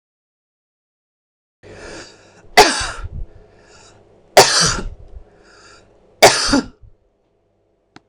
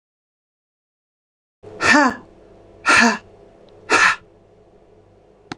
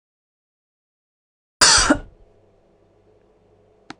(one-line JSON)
{"three_cough_length": "8.1 s", "three_cough_amplitude": 26028, "three_cough_signal_mean_std_ratio": 0.3, "exhalation_length": "5.6 s", "exhalation_amplitude": 26005, "exhalation_signal_mean_std_ratio": 0.34, "cough_length": "4.0 s", "cough_amplitude": 26028, "cough_signal_mean_std_ratio": 0.25, "survey_phase": "alpha (2021-03-01 to 2021-08-12)", "age": "45-64", "gender": "Female", "wearing_mask": "No", "symptom_none": true, "smoker_status": "Ex-smoker", "respiratory_condition_asthma": false, "respiratory_condition_other": false, "recruitment_source": "REACT", "submission_delay": "2 days", "covid_test_result": "Negative", "covid_test_method": "RT-qPCR"}